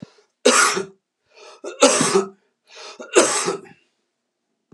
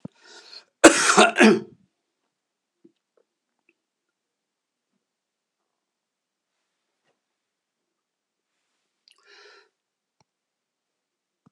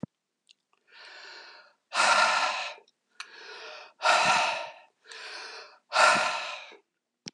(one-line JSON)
{"three_cough_length": "4.7 s", "three_cough_amplitude": 32625, "three_cough_signal_mean_std_ratio": 0.41, "cough_length": "11.5 s", "cough_amplitude": 32768, "cough_signal_mean_std_ratio": 0.18, "exhalation_length": "7.3 s", "exhalation_amplitude": 12331, "exhalation_signal_mean_std_ratio": 0.46, "survey_phase": "alpha (2021-03-01 to 2021-08-12)", "age": "65+", "gender": "Male", "wearing_mask": "No", "symptom_none": true, "smoker_status": "Ex-smoker", "respiratory_condition_asthma": false, "respiratory_condition_other": false, "recruitment_source": "REACT", "submission_delay": "2 days", "covid_test_result": "Negative", "covid_test_method": "RT-qPCR"}